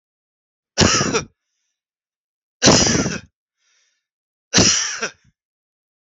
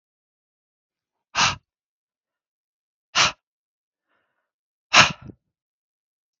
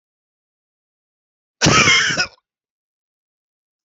three_cough_length: 6.1 s
three_cough_amplitude: 32768
three_cough_signal_mean_std_ratio: 0.37
exhalation_length: 6.4 s
exhalation_amplitude: 32768
exhalation_signal_mean_std_ratio: 0.2
cough_length: 3.8 s
cough_amplitude: 32766
cough_signal_mean_std_ratio: 0.32
survey_phase: beta (2021-08-13 to 2022-03-07)
age: 65+
gender: Male
wearing_mask: 'No'
symptom_none: true
smoker_status: Never smoked
respiratory_condition_asthma: false
respiratory_condition_other: false
recruitment_source: REACT
submission_delay: 0 days
covid_test_result: Negative
covid_test_method: RT-qPCR
influenza_a_test_result: Negative
influenza_b_test_result: Negative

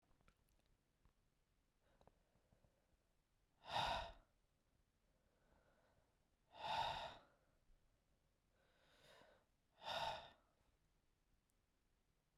exhalation_length: 12.4 s
exhalation_amplitude: 943
exhalation_signal_mean_std_ratio: 0.3
survey_phase: beta (2021-08-13 to 2022-03-07)
age: 18-44
gender: Male
wearing_mask: 'No'
symptom_cough_any: true
symptom_runny_or_blocked_nose: true
symptom_sore_throat: true
symptom_abdominal_pain: true
symptom_fatigue: true
symptom_headache: true
smoker_status: Never smoked
respiratory_condition_asthma: false
respiratory_condition_other: false
recruitment_source: Test and Trace
submission_delay: 1 day
covid_test_method: LFT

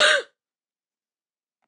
cough_length: 1.7 s
cough_amplitude: 17315
cough_signal_mean_std_ratio: 0.29
survey_phase: beta (2021-08-13 to 2022-03-07)
age: 45-64
gender: Female
wearing_mask: 'No'
symptom_cough_any: true
symptom_runny_or_blocked_nose: true
symptom_sore_throat: true
symptom_fatigue: true
symptom_fever_high_temperature: true
symptom_headache: true
symptom_other: true
symptom_onset: 8 days
smoker_status: Never smoked
respiratory_condition_asthma: false
respiratory_condition_other: false
recruitment_source: Test and Trace
submission_delay: 1 day
covid_test_result: Positive
covid_test_method: RT-qPCR
covid_ct_value: 30.3
covid_ct_gene: N gene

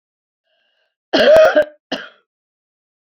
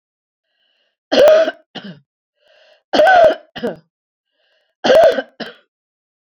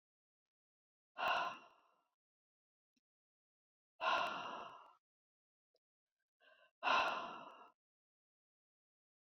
cough_length: 3.2 s
cough_amplitude: 28468
cough_signal_mean_std_ratio: 0.35
three_cough_length: 6.3 s
three_cough_amplitude: 28333
three_cough_signal_mean_std_ratio: 0.39
exhalation_length: 9.3 s
exhalation_amplitude: 2223
exhalation_signal_mean_std_ratio: 0.32
survey_phase: beta (2021-08-13 to 2022-03-07)
age: 65+
gender: Female
wearing_mask: 'No'
symptom_cough_any: true
smoker_status: Never smoked
respiratory_condition_asthma: false
respiratory_condition_other: false
recruitment_source: REACT
submission_delay: 1 day
covid_test_result: Negative
covid_test_method: RT-qPCR
influenza_a_test_result: Negative
influenza_b_test_result: Negative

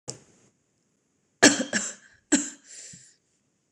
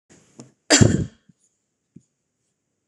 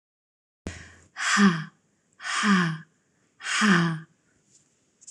three_cough_length: 3.7 s
three_cough_amplitude: 26027
three_cough_signal_mean_std_ratio: 0.26
cough_length: 2.9 s
cough_amplitude: 26028
cough_signal_mean_std_ratio: 0.25
exhalation_length: 5.1 s
exhalation_amplitude: 14133
exhalation_signal_mean_std_ratio: 0.45
survey_phase: beta (2021-08-13 to 2022-03-07)
age: 18-44
gender: Female
wearing_mask: 'No'
symptom_cough_any: true
symptom_runny_or_blocked_nose: true
symptom_fatigue: true
symptom_fever_high_temperature: true
symptom_headache: true
symptom_onset: 7 days
smoker_status: Ex-smoker
respiratory_condition_asthma: false
respiratory_condition_other: false
recruitment_source: Test and Trace
submission_delay: 1 day
covid_test_result: Negative
covid_test_method: RT-qPCR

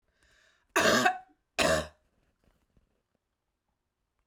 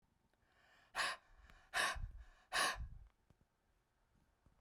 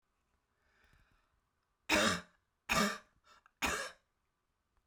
cough_length: 4.3 s
cough_amplitude: 10233
cough_signal_mean_std_ratio: 0.32
exhalation_length: 4.6 s
exhalation_amplitude: 2253
exhalation_signal_mean_std_ratio: 0.39
three_cough_length: 4.9 s
three_cough_amplitude: 4429
three_cough_signal_mean_std_ratio: 0.33
survey_phase: beta (2021-08-13 to 2022-03-07)
age: 45-64
gender: Female
wearing_mask: 'No'
symptom_cough_any: true
symptom_sore_throat: true
symptom_fatigue: true
symptom_headache: true
smoker_status: Ex-smoker
respiratory_condition_asthma: false
respiratory_condition_other: false
recruitment_source: Test and Trace
submission_delay: 1 day
covid_test_result: Positive
covid_test_method: RT-qPCR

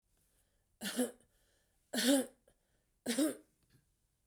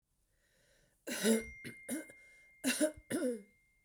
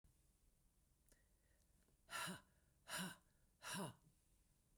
three_cough_length: 4.3 s
three_cough_amplitude: 4141
three_cough_signal_mean_std_ratio: 0.35
cough_length: 3.8 s
cough_amplitude: 4309
cough_signal_mean_std_ratio: 0.45
exhalation_length: 4.8 s
exhalation_amplitude: 573
exhalation_signal_mean_std_ratio: 0.41
survey_phase: beta (2021-08-13 to 2022-03-07)
age: 45-64
gender: Female
wearing_mask: 'No'
symptom_runny_or_blocked_nose: true
symptom_sore_throat: true
symptom_fatigue: true
symptom_headache: true
symptom_change_to_sense_of_smell_or_taste: true
symptom_loss_of_taste: true
symptom_onset: 2 days
smoker_status: Ex-smoker
respiratory_condition_asthma: false
respiratory_condition_other: false
recruitment_source: Test and Trace
submission_delay: 2 days
covid_test_result: Positive
covid_test_method: RT-qPCR
covid_ct_value: 23.5
covid_ct_gene: ORF1ab gene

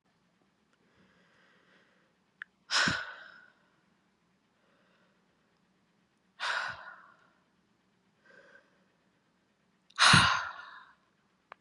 exhalation_length: 11.6 s
exhalation_amplitude: 13698
exhalation_signal_mean_std_ratio: 0.24
survey_phase: beta (2021-08-13 to 2022-03-07)
age: 18-44
gender: Female
wearing_mask: 'No'
symptom_new_continuous_cough: true
symptom_runny_or_blocked_nose: true
symptom_sore_throat: true
smoker_status: Ex-smoker
respiratory_condition_asthma: true
respiratory_condition_other: false
recruitment_source: Test and Trace
submission_delay: 1 day
covid_test_result: Positive
covid_test_method: LFT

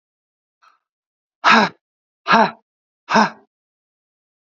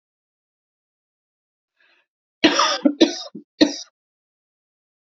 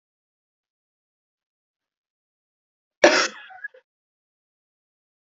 exhalation_length: 4.4 s
exhalation_amplitude: 29898
exhalation_signal_mean_std_ratio: 0.29
three_cough_length: 5.0 s
three_cough_amplitude: 28422
three_cough_signal_mean_std_ratio: 0.27
cough_length: 5.3 s
cough_amplitude: 28006
cough_signal_mean_std_ratio: 0.16
survey_phase: beta (2021-08-13 to 2022-03-07)
age: 18-44
gender: Female
wearing_mask: 'No'
symptom_cough_any: true
symptom_sore_throat: true
symptom_onset: 2 days
smoker_status: Ex-smoker
respiratory_condition_asthma: false
respiratory_condition_other: false
recruitment_source: Test and Trace
submission_delay: 2 days
covid_test_result: Positive
covid_test_method: RT-qPCR
covid_ct_value: 24.2
covid_ct_gene: ORF1ab gene
covid_ct_mean: 24.7
covid_viral_load: 7700 copies/ml
covid_viral_load_category: Minimal viral load (< 10K copies/ml)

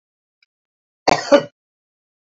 cough_length: 2.3 s
cough_amplitude: 27549
cough_signal_mean_std_ratio: 0.23
survey_phase: beta (2021-08-13 to 2022-03-07)
age: 45-64
gender: Female
wearing_mask: 'No'
symptom_none: true
smoker_status: Ex-smoker
respiratory_condition_asthma: false
respiratory_condition_other: false
recruitment_source: REACT
submission_delay: 0 days
covid_test_result: Negative
covid_test_method: RT-qPCR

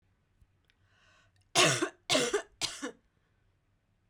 three_cough_length: 4.1 s
three_cough_amplitude: 10042
three_cough_signal_mean_std_ratio: 0.34
survey_phase: beta (2021-08-13 to 2022-03-07)
age: 18-44
gender: Female
wearing_mask: 'No'
symptom_cough_any: true
symptom_runny_or_blocked_nose: true
symptom_shortness_of_breath: true
symptom_sore_throat: true
symptom_abdominal_pain: true
symptom_diarrhoea: true
symptom_fatigue: true
symptom_fever_high_temperature: true
symptom_change_to_sense_of_smell_or_taste: true
symptom_loss_of_taste: true
smoker_status: Current smoker (e-cigarettes or vapes only)
respiratory_condition_asthma: false
respiratory_condition_other: false
recruitment_source: Test and Trace
submission_delay: 1 day
covid_test_result: Positive
covid_test_method: LFT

